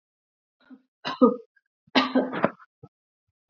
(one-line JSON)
{"three_cough_length": "3.5 s", "three_cough_amplitude": 22638, "three_cough_signal_mean_std_ratio": 0.3, "survey_phase": "beta (2021-08-13 to 2022-03-07)", "age": "18-44", "gender": "Female", "wearing_mask": "No", "symptom_fatigue": true, "symptom_headache": true, "symptom_onset": "5 days", "smoker_status": "Ex-smoker", "respiratory_condition_asthma": false, "respiratory_condition_other": false, "recruitment_source": "REACT", "submission_delay": "1 day", "covid_test_result": "Negative", "covid_test_method": "RT-qPCR", "influenza_a_test_result": "Negative", "influenza_b_test_result": "Negative"}